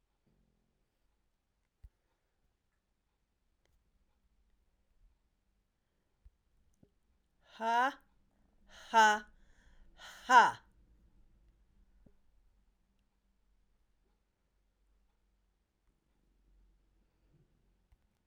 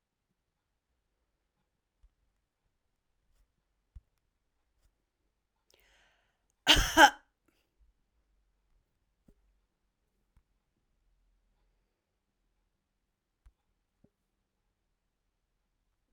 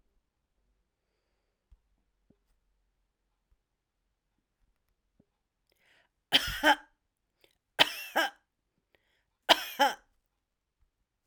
exhalation_length: 18.3 s
exhalation_amplitude: 9708
exhalation_signal_mean_std_ratio: 0.17
cough_length: 16.1 s
cough_amplitude: 17618
cough_signal_mean_std_ratio: 0.11
three_cough_length: 11.3 s
three_cough_amplitude: 20868
three_cough_signal_mean_std_ratio: 0.2
survey_phase: alpha (2021-03-01 to 2021-08-12)
age: 45-64
gender: Female
wearing_mask: 'No'
symptom_none: true
smoker_status: Never smoked
respiratory_condition_asthma: false
respiratory_condition_other: false
recruitment_source: REACT
submission_delay: 2 days
covid_test_result: Negative
covid_test_method: RT-qPCR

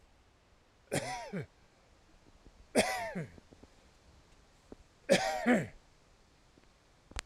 cough_length: 7.3 s
cough_amplitude: 7825
cough_signal_mean_std_ratio: 0.36
survey_phase: alpha (2021-03-01 to 2021-08-12)
age: 65+
gender: Male
wearing_mask: 'No'
symptom_none: true
smoker_status: Never smoked
respiratory_condition_asthma: false
respiratory_condition_other: false
recruitment_source: REACT
submission_delay: 1 day
covid_test_result: Negative
covid_test_method: RT-qPCR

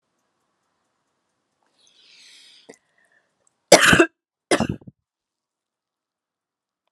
cough_length: 6.9 s
cough_amplitude: 32768
cough_signal_mean_std_ratio: 0.19
survey_phase: alpha (2021-03-01 to 2021-08-12)
age: 65+
gender: Female
wearing_mask: 'No'
symptom_abdominal_pain: true
symptom_fatigue: true
symptom_headache: true
symptom_onset: 12 days
smoker_status: Ex-smoker
respiratory_condition_asthma: false
respiratory_condition_other: false
recruitment_source: REACT
submission_delay: 2 days
covid_test_result: Negative
covid_test_method: RT-qPCR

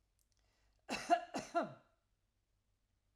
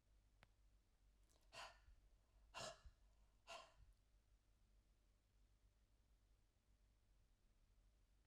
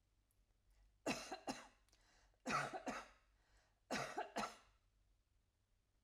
cough_length: 3.2 s
cough_amplitude: 3414
cough_signal_mean_std_ratio: 0.29
exhalation_length: 8.3 s
exhalation_amplitude: 284
exhalation_signal_mean_std_ratio: 0.51
three_cough_length: 6.0 s
three_cough_amplitude: 1100
three_cough_signal_mean_std_ratio: 0.41
survey_phase: alpha (2021-03-01 to 2021-08-12)
age: 45-64
gender: Female
wearing_mask: 'No'
symptom_none: true
smoker_status: Never smoked
respiratory_condition_asthma: false
respiratory_condition_other: false
recruitment_source: REACT
submission_delay: 0 days
covid_test_result: Negative
covid_test_method: RT-qPCR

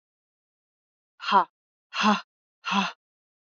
exhalation_length: 3.6 s
exhalation_amplitude: 16340
exhalation_signal_mean_std_ratio: 0.32
survey_phase: alpha (2021-03-01 to 2021-08-12)
age: 18-44
gender: Female
wearing_mask: 'No'
symptom_none: true
smoker_status: Never smoked
respiratory_condition_asthma: false
respiratory_condition_other: false
recruitment_source: REACT
submission_delay: 1 day
covid_test_result: Negative
covid_test_method: RT-qPCR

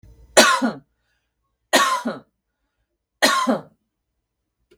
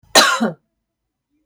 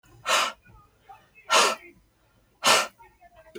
three_cough_length: 4.8 s
three_cough_amplitude: 32768
three_cough_signal_mean_std_ratio: 0.36
cough_length: 1.5 s
cough_amplitude: 32768
cough_signal_mean_std_ratio: 0.37
exhalation_length: 3.6 s
exhalation_amplitude: 19690
exhalation_signal_mean_std_ratio: 0.38
survey_phase: beta (2021-08-13 to 2022-03-07)
age: 45-64
gender: Female
wearing_mask: 'No'
symptom_none: true
smoker_status: Ex-smoker
respiratory_condition_asthma: false
respiratory_condition_other: false
recruitment_source: REACT
submission_delay: 2 days
covid_test_result: Negative
covid_test_method: RT-qPCR
influenza_a_test_result: Unknown/Void
influenza_b_test_result: Unknown/Void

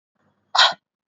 exhalation_length: 1.2 s
exhalation_amplitude: 28824
exhalation_signal_mean_std_ratio: 0.29
survey_phase: beta (2021-08-13 to 2022-03-07)
age: 18-44
gender: Female
wearing_mask: 'No'
symptom_cough_any: true
symptom_runny_or_blocked_nose: true
symptom_sore_throat: true
symptom_fatigue: true
symptom_headache: true
symptom_onset: 3 days
smoker_status: Ex-smoker
respiratory_condition_asthma: false
respiratory_condition_other: false
recruitment_source: Test and Trace
submission_delay: 2 days
covid_test_result: Positive
covid_test_method: ePCR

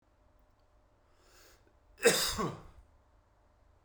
cough_length: 3.8 s
cough_amplitude: 9684
cough_signal_mean_std_ratio: 0.28
survey_phase: beta (2021-08-13 to 2022-03-07)
age: 18-44
gender: Male
wearing_mask: 'No'
symptom_cough_any: true
symptom_new_continuous_cough: true
symptom_sore_throat: true
symptom_headache: true
symptom_onset: 3 days
smoker_status: Never smoked
respiratory_condition_asthma: false
respiratory_condition_other: false
recruitment_source: Test and Trace
submission_delay: 2 days
covid_test_result: Positive
covid_test_method: RT-qPCR
covid_ct_value: 29.4
covid_ct_gene: N gene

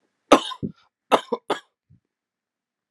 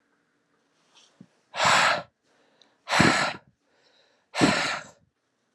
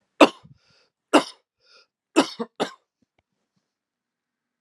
cough_length: 2.9 s
cough_amplitude: 32767
cough_signal_mean_std_ratio: 0.22
exhalation_length: 5.5 s
exhalation_amplitude: 24998
exhalation_signal_mean_std_ratio: 0.39
three_cough_length: 4.6 s
three_cough_amplitude: 32767
three_cough_signal_mean_std_ratio: 0.19
survey_phase: alpha (2021-03-01 to 2021-08-12)
age: 18-44
gender: Male
wearing_mask: 'No'
symptom_cough_any: true
symptom_new_continuous_cough: true
symptom_fever_high_temperature: true
symptom_onset: 3 days
smoker_status: Never smoked
respiratory_condition_asthma: false
respiratory_condition_other: false
recruitment_source: Test and Trace
submission_delay: 1 day
covid_test_result: Positive
covid_test_method: RT-qPCR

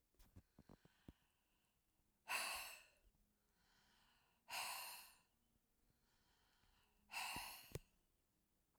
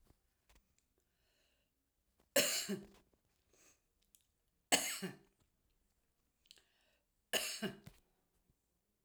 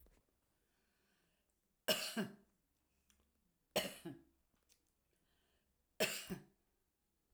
exhalation_length: 8.8 s
exhalation_amplitude: 821
exhalation_signal_mean_std_ratio: 0.38
cough_length: 9.0 s
cough_amplitude: 5584
cough_signal_mean_std_ratio: 0.26
three_cough_length: 7.3 s
three_cough_amplitude: 2818
three_cough_signal_mean_std_ratio: 0.27
survey_phase: alpha (2021-03-01 to 2021-08-12)
age: 45-64
gender: Female
wearing_mask: 'No'
symptom_none: true
smoker_status: Current smoker (1 to 10 cigarettes per day)
respiratory_condition_asthma: false
respiratory_condition_other: false
recruitment_source: REACT
submission_delay: 1 day
covid_test_result: Negative
covid_test_method: RT-qPCR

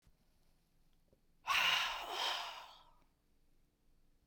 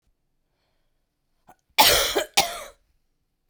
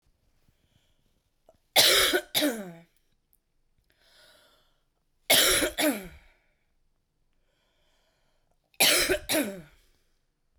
exhalation_length: 4.3 s
exhalation_amplitude: 3034
exhalation_signal_mean_std_ratio: 0.41
cough_length: 3.5 s
cough_amplitude: 32768
cough_signal_mean_std_ratio: 0.31
three_cough_length: 10.6 s
three_cough_amplitude: 15846
three_cough_signal_mean_std_ratio: 0.34
survey_phase: beta (2021-08-13 to 2022-03-07)
age: 18-44
gender: Female
wearing_mask: 'No'
symptom_runny_or_blocked_nose: true
symptom_headache: true
symptom_onset: 4 days
smoker_status: Ex-smoker
respiratory_condition_asthma: false
respiratory_condition_other: false
recruitment_source: Test and Trace
submission_delay: 1 day
covid_test_result: Positive
covid_test_method: RT-qPCR
covid_ct_value: 28.5
covid_ct_gene: ORF1ab gene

